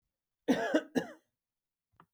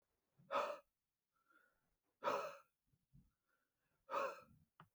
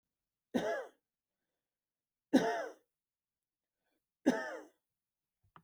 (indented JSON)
{
  "cough_length": "2.1 s",
  "cough_amplitude": 5992,
  "cough_signal_mean_std_ratio": 0.33,
  "exhalation_length": "4.9 s",
  "exhalation_amplitude": 1354,
  "exhalation_signal_mean_std_ratio": 0.33,
  "three_cough_length": "5.6 s",
  "three_cough_amplitude": 6307,
  "three_cough_signal_mean_std_ratio": 0.28,
  "survey_phase": "beta (2021-08-13 to 2022-03-07)",
  "age": "45-64",
  "gender": "Male",
  "wearing_mask": "No",
  "symptom_none": true,
  "smoker_status": "Ex-smoker",
  "respiratory_condition_asthma": false,
  "respiratory_condition_other": false,
  "recruitment_source": "REACT",
  "submission_delay": "2 days",
  "covid_test_result": "Negative",
  "covid_test_method": "RT-qPCR"
}